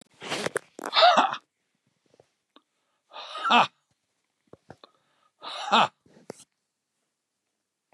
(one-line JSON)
{"exhalation_length": "7.9 s", "exhalation_amplitude": 18755, "exhalation_signal_mean_std_ratio": 0.29, "survey_phase": "beta (2021-08-13 to 2022-03-07)", "age": "65+", "gender": "Male", "wearing_mask": "No", "symptom_none": true, "smoker_status": "Ex-smoker", "respiratory_condition_asthma": false, "respiratory_condition_other": false, "recruitment_source": "REACT", "submission_delay": "2 days", "covid_test_result": "Negative", "covid_test_method": "RT-qPCR", "influenza_a_test_result": "Negative", "influenza_b_test_result": "Negative"}